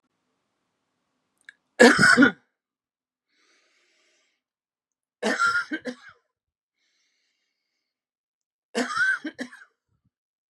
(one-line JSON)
{"three_cough_length": "10.5 s", "three_cough_amplitude": 29386, "three_cough_signal_mean_std_ratio": 0.26, "survey_phase": "beta (2021-08-13 to 2022-03-07)", "age": "45-64", "gender": "Male", "wearing_mask": "No", "symptom_none": true, "smoker_status": "Never smoked", "respiratory_condition_asthma": false, "respiratory_condition_other": false, "recruitment_source": "REACT", "submission_delay": "0 days", "covid_test_result": "Negative", "covid_test_method": "RT-qPCR"}